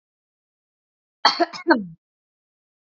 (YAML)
cough_length: 2.8 s
cough_amplitude: 26541
cough_signal_mean_std_ratio: 0.26
survey_phase: beta (2021-08-13 to 2022-03-07)
age: 45-64
gender: Female
wearing_mask: 'No'
symptom_none: true
smoker_status: Never smoked
respiratory_condition_asthma: false
respiratory_condition_other: false
recruitment_source: REACT
submission_delay: 4 days
covid_test_result: Negative
covid_test_method: RT-qPCR
influenza_a_test_result: Negative
influenza_b_test_result: Negative